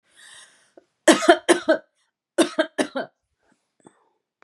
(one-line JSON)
{"cough_length": "4.4 s", "cough_amplitude": 32766, "cough_signal_mean_std_ratio": 0.3, "survey_phase": "beta (2021-08-13 to 2022-03-07)", "age": "18-44", "gender": "Female", "wearing_mask": "No", "symptom_runny_or_blocked_nose": true, "symptom_shortness_of_breath": true, "smoker_status": "Ex-smoker", "respiratory_condition_asthma": false, "respiratory_condition_other": false, "recruitment_source": "Test and Trace", "submission_delay": "2 days", "covid_test_result": "Positive", "covid_test_method": "ePCR"}